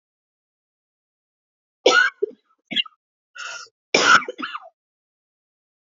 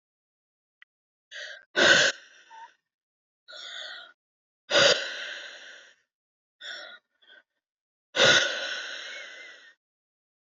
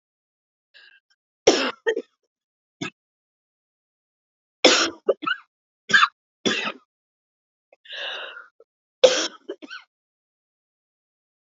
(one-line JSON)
{"cough_length": "6.0 s", "cough_amplitude": 28373, "cough_signal_mean_std_ratio": 0.28, "exhalation_length": "10.6 s", "exhalation_amplitude": 16967, "exhalation_signal_mean_std_ratio": 0.32, "three_cough_length": "11.4 s", "three_cough_amplitude": 30863, "three_cough_signal_mean_std_ratio": 0.27, "survey_phase": "alpha (2021-03-01 to 2021-08-12)", "age": "45-64", "gender": "Female", "wearing_mask": "No", "symptom_cough_any": true, "symptom_new_continuous_cough": true, "symptom_fatigue": true, "symptom_fever_high_temperature": true, "symptom_headache": true, "symptom_change_to_sense_of_smell_or_taste": true, "symptom_loss_of_taste": true, "symptom_onset": "5 days", "smoker_status": "Never smoked", "respiratory_condition_asthma": false, "respiratory_condition_other": false, "recruitment_source": "Test and Trace", "submission_delay": "2 days", "covid_test_result": "Positive", "covid_test_method": "RT-qPCR"}